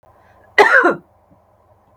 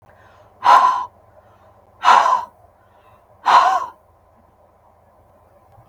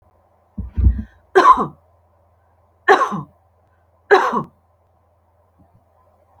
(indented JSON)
{
  "cough_length": "2.0 s",
  "cough_amplitude": 32768,
  "cough_signal_mean_std_ratio": 0.36,
  "exhalation_length": "5.9 s",
  "exhalation_amplitude": 32768,
  "exhalation_signal_mean_std_ratio": 0.37,
  "three_cough_length": "6.4 s",
  "three_cough_amplitude": 32768,
  "three_cough_signal_mean_std_ratio": 0.32,
  "survey_phase": "beta (2021-08-13 to 2022-03-07)",
  "age": "45-64",
  "gender": "Female",
  "wearing_mask": "No",
  "symptom_cough_any": true,
  "symptom_runny_or_blocked_nose": true,
  "symptom_fatigue": true,
  "symptom_change_to_sense_of_smell_or_taste": true,
  "symptom_onset": "5 days",
  "smoker_status": "Never smoked",
  "respiratory_condition_asthma": false,
  "respiratory_condition_other": false,
  "recruitment_source": "Test and Trace",
  "submission_delay": "1 day",
  "covid_test_result": "Negative",
  "covid_test_method": "RT-qPCR"
}